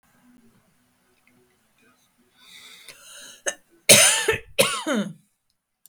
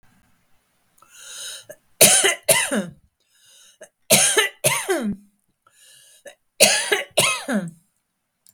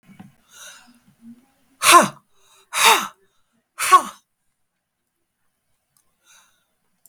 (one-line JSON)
{"cough_length": "5.9 s", "cough_amplitude": 32768, "cough_signal_mean_std_ratio": 0.29, "three_cough_length": "8.5 s", "three_cough_amplitude": 32768, "three_cough_signal_mean_std_ratio": 0.41, "exhalation_length": "7.1 s", "exhalation_amplitude": 32768, "exhalation_signal_mean_std_ratio": 0.25, "survey_phase": "beta (2021-08-13 to 2022-03-07)", "age": "65+", "gender": "Female", "wearing_mask": "No", "symptom_cough_any": true, "smoker_status": "Ex-smoker", "respiratory_condition_asthma": true, "respiratory_condition_other": false, "recruitment_source": "REACT", "submission_delay": "2 days", "covid_test_result": "Negative", "covid_test_method": "RT-qPCR", "influenza_a_test_result": "Negative", "influenza_b_test_result": "Negative"}